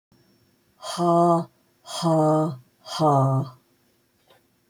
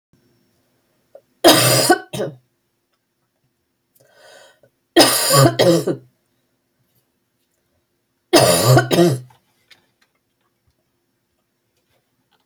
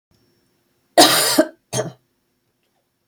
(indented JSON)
{
  "exhalation_length": "4.7 s",
  "exhalation_amplitude": 12561,
  "exhalation_signal_mean_std_ratio": 0.55,
  "three_cough_length": "12.5 s",
  "three_cough_amplitude": 32768,
  "three_cough_signal_mean_std_ratio": 0.34,
  "cough_length": "3.1 s",
  "cough_amplitude": 31022,
  "cough_signal_mean_std_ratio": 0.32,
  "survey_phase": "beta (2021-08-13 to 2022-03-07)",
  "age": "45-64",
  "gender": "Female",
  "wearing_mask": "No",
  "symptom_cough_any": true,
  "symptom_change_to_sense_of_smell_or_taste": true,
  "symptom_onset": "5 days",
  "smoker_status": "Ex-smoker",
  "respiratory_condition_asthma": false,
  "respiratory_condition_other": false,
  "recruitment_source": "Test and Trace",
  "submission_delay": "2 days",
  "covid_test_result": "Positive",
  "covid_test_method": "RT-qPCR"
}